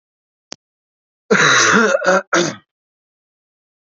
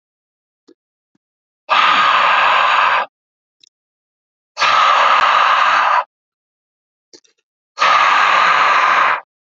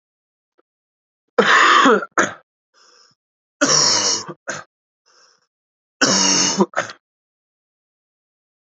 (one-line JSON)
{"cough_length": "3.9 s", "cough_amplitude": 30431, "cough_signal_mean_std_ratio": 0.44, "exhalation_length": "9.6 s", "exhalation_amplitude": 32379, "exhalation_signal_mean_std_ratio": 0.62, "three_cough_length": "8.6 s", "three_cough_amplitude": 32768, "three_cough_signal_mean_std_ratio": 0.4, "survey_phase": "alpha (2021-03-01 to 2021-08-12)", "age": "18-44", "gender": "Male", "wearing_mask": "No", "symptom_cough_any": true, "symptom_new_continuous_cough": true, "symptom_abdominal_pain": true, "symptom_fatigue": true, "symptom_headache": true, "symptom_change_to_sense_of_smell_or_taste": true, "symptom_loss_of_taste": true, "symptom_onset": "3 days", "smoker_status": "Never smoked", "respiratory_condition_asthma": false, "respiratory_condition_other": false, "recruitment_source": "Test and Trace", "submission_delay": "1 day", "covid_test_result": "Positive", "covid_test_method": "RT-qPCR"}